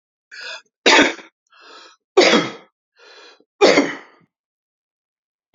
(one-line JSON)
{"three_cough_length": "5.5 s", "three_cough_amplitude": 31252, "three_cough_signal_mean_std_ratio": 0.33, "survey_phase": "beta (2021-08-13 to 2022-03-07)", "age": "65+", "gender": "Male", "wearing_mask": "No", "symptom_cough_any": true, "symptom_sore_throat": true, "smoker_status": "Ex-smoker", "respiratory_condition_asthma": false, "respiratory_condition_other": false, "recruitment_source": "REACT", "submission_delay": "1 day", "covid_test_result": "Positive", "covid_test_method": "RT-qPCR", "covid_ct_value": 21.0, "covid_ct_gene": "E gene", "influenza_a_test_result": "Negative", "influenza_b_test_result": "Negative"}